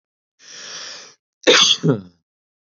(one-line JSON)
{"cough_length": "2.7 s", "cough_amplitude": 29083, "cough_signal_mean_std_ratio": 0.36, "survey_phase": "beta (2021-08-13 to 2022-03-07)", "age": "18-44", "gender": "Male", "wearing_mask": "No", "symptom_none": true, "symptom_onset": "3 days", "smoker_status": "Ex-smoker", "respiratory_condition_asthma": false, "respiratory_condition_other": false, "recruitment_source": "REACT", "submission_delay": "1 day", "covid_test_result": "Negative", "covid_test_method": "RT-qPCR", "influenza_a_test_result": "Negative", "influenza_b_test_result": "Negative"}